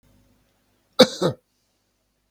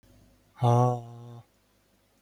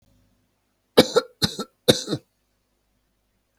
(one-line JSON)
{"cough_length": "2.3 s", "cough_amplitude": 32768, "cough_signal_mean_std_ratio": 0.2, "exhalation_length": "2.2 s", "exhalation_amplitude": 10686, "exhalation_signal_mean_std_ratio": 0.37, "three_cough_length": "3.6 s", "three_cough_amplitude": 32768, "three_cough_signal_mean_std_ratio": 0.23, "survey_phase": "beta (2021-08-13 to 2022-03-07)", "age": "45-64", "gender": "Male", "wearing_mask": "No", "symptom_none": true, "smoker_status": "Current smoker (e-cigarettes or vapes only)", "respiratory_condition_asthma": false, "respiratory_condition_other": false, "recruitment_source": "REACT", "submission_delay": "3 days", "covid_test_result": "Negative", "covid_test_method": "RT-qPCR", "influenza_a_test_result": "Negative", "influenza_b_test_result": "Negative"}